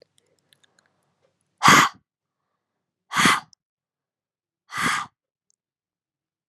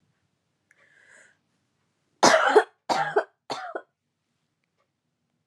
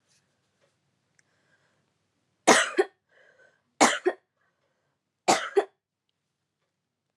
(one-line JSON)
{"exhalation_length": "6.5 s", "exhalation_amplitude": 32335, "exhalation_signal_mean_std_ratio": 0.25, "cough_length": "5.5 s", "cough_amplitude": 29243, "cough_signal_mean_std_ratio": 0.28, "three_cough_length": "7.2 s", "three_cough_amplitude": 24054, "three_cough_signal_mean_std_ratio": 0.24, "survey_phase": "alpha (2021-03-01 to 2021-08-12)", "age": "18-44", "gender": "Female", "wearing_mask": "No", "symptom_cough_any": true, "symptom_change_to_sense_of_smell_or_taste": true, "symptom_onset": "3 days", "smoker_status": "Never smoked", "respiratory_condition_asthma": false, "respiratory_condition_other": false, "recruitment_source": "Test and Trace", "submission_delay": "1 day", "covid_ct_value": 28.9, "covid_ct_gene": "ORF1ab gene"}